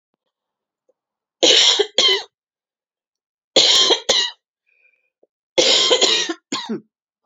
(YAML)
three_cough_length: 7.3 s
three_cough_amplitude: 32369
three_cough_signal_mean_std_ratio: 0.45
survey_phase: alpha (2021-03-01 to 2021-08-12)
age: 18-44
gender: Female
wearing_mask: 'No'
symptom_cough_any: true
symptom_new_continuous_cough: true
symptom_change_to_sense_of_smell_or_taste: true
symptom_loss_of_taste: true
smoker_status: Never smoked
respiratory_condition_asthma: false
respiratory_condition_other: false
recruitment_source: Test and Trace
submission_delay: 1 day
covid_test_result: Positive
covid_test_method: RT-qPCR
covid_ct_value: 28.9
covid_ct_gene: ORF1ab gene
covid_ct_mean: 30.1
covid_viral_load: 140 copies/ml
covid_viral_load_category: Minimal viral load (< 10K copies/ml)